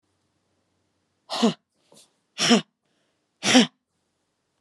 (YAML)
exhalation_length: 4.6 s
exhalation_amplitude: 31491
exhalation_signal_mean_std_ratio: 0.27
survey_phase: beta (2021-08-13 to 2022-03-07)
age: 18-44
gender: Female
wearing_mask: 'Yes'
symptom_fatigue: true
symptom_headache: true
symptom_change_to_sense_of_smell_or_taste: true
symptom_loss_of_taste: true
symptom_onset: 3 days
smoker_status: Never smoked
respiratory_condition_asthma: true
respiratory_condition_other: false
recruitment_source: Test and Trace
submission_delay: 2 days
covid_test_result: Positive
covid_test_method: RT-qPCR
covid_ct_value: 17.5
covid_ct_gene: N gene
covid_ct_mean: 17.8
covid_viral_load: 1500000 copies/ml
covid_viral_load_category: High viral load (>1M copies/ml)